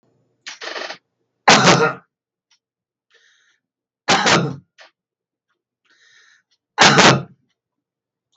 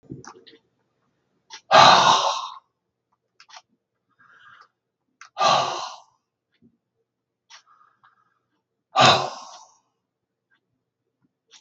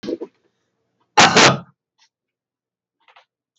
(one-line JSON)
{"three_cough_length": "8.4 s", "three_cough_amplitude": 32768, "three_cough_signal_mean_std_ratio": 0.33, "exhalation_length": "11.6 s", "exhalation_amplitude": 32768, "exhalation_signal_mean_std_ratio": 0.27, "cough_length": "3.6 s", "cough_amplitude": 32768, "cough_signal_mean_std_ratio": 0.29, "survey_phase": "beta (2021-08-13 to 2022-03-07)", "age": "65+", "gender": "Male", "wearing_mask": "No", "symptom_none": true, "smoker_status": "Ex-smoker", "respiratory_condition_asthma": false, "respiratory_condition_other": false, "recruitment_source": "REACT", "submission_delay": "0 days", "covid_test_result": "Negative", "covid_test_method": "RT-qPCR", "influenza_a_test_result": "Unknown/Void", "influenza_b_test_result": "Unknown/Void"}